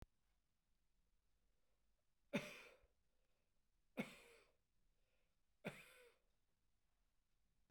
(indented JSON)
{
  "three_cough_length": "7.7 s",
  "three_cough_amplitude": 1043,
  "three_cough_signal_mean_std_ratio": 0.25,
  "survey_phase": "beta (2021-08-13 to 2022-03-07)",
  "age": "45-64",
  "gender": "Male",
  "wearing_mask": "No",
  "symptom_none": true,
  "smoker_status": "Ex-smoker",
  "respiratory_condition_asthma": false,
  "respiratory_condition_other": false,
  "recruitment_source": "REACT",
  "submission_delay": "2 days",
  "covid_test_result": "Negative",
  "covid_test_method": "RT-qPCR",
  "influenza_a_test_result": "Unknown/Void",
  "influenza_b_test_result": "Unknown/Void"
}